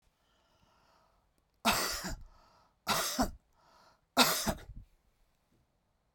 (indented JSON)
{
  "three_cough_length": "6.1 s",
  "three_cough_amplitude": 10209,
  "three_cough_signal_mean_std_ratio": 0.35,
  "survey_phase": "beta (2021-08-13 to 2022-03-07)",
  "age": "65+",
  "gender": "Female",
  "wearing_mask": "No",
  "symptom_cough_any": true,
  "symptom_runny_or_blocked_nose": true,
  "symptom_sore_throat": true,
  "symptom_fatigue": true,
  "smoker_status": "Ex-smoker",
  "respiratory_condition_asthma": false,
  "respiratory_condition_other": false,
  "recruitment_source": "Test and Trace",
  "submission_delay": "2 days",
  "covid_test_result": "Positive",
  "covid_test_method": "RT-qPCR"
}